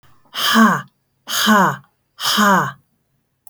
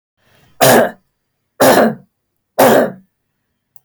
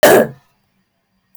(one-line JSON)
{"exhalation_length": "3.5 s", "exhalation_amplitude": 28281, "exhalation_signal_mean_std_ratio": 0.53, "three_cough_length": "3.8 s", "three_cough_amplitude": 32337, "three_cough_signal_mean_std_ratio": 0.44, "cough_length": "1.4 s", "cough_amplitude": 32683, "cough_signal_mean_std_ratio": 0.37, "survey_phase": "beta (2021-08-13 to 2022-03-07)", "age": "45-64", "gender": "Female", "wearing_mask": "No", "symptom_cough_any": true, "symptom_runny_or_blocked_nose": true, "symptom_fatigue": true, "symptom_headache": true, "symptom_change_to_sense_of_smell_or_taste": true, "symptom_loss_of_taste": true, "symptom_onset": "5 days", "smoker_status": "Never smoked", "respiratory_condition_asthma": false, "respiratory_condition_other": false, "recruitment_source": "Test and Trace", "submission_delay": "1 day", "covid_test_result": "Positive", "covid_test_method": "RT-qPCR", "covid_ct_value": 20.8, "covid_ct_gene": "ORF1ab gene", "covid_ct_mean": 21.2, "covid_viral_load": "110000 copies/ml", "covid_viral_load_category": "Low viral load (10K-1M copies/ml)"}